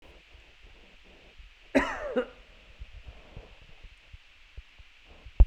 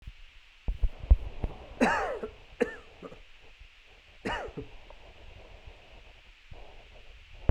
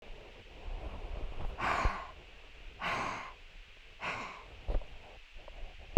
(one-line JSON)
{"cough_length": "5.5 s", "cough_amplitude": 17485, "cough_signal_mean_std_ratio": 0.24, "three_cough_length": "7.5 s", "three_cough_amplitude": 13886, "three_cough_signal_mean_std_ratio": 0.33, "exhalation_length": "6.0 s", "exhalation_amplitude": 19761, "exhalation_signal_mean_std_ratio": 0.42, "survey_phase": "beta (2021-08-13 to 2022-03-07)", "age": "18-44", "gender": "Male", "wearing_mask": "No", "symptom_none": true, "smoker_status": "Never smoked", "respiratory_condition_asthma": false, "respiratory_condition_other": false, "recruitment_source": "REACT", "submission_delay": "1 day", "covid_test_result": "Negative", "covid_test_method": "RT-qPCR", "influenza_a_test_result": "Unknown/Void", "influenza_b_test_result": "Unknown/Void"}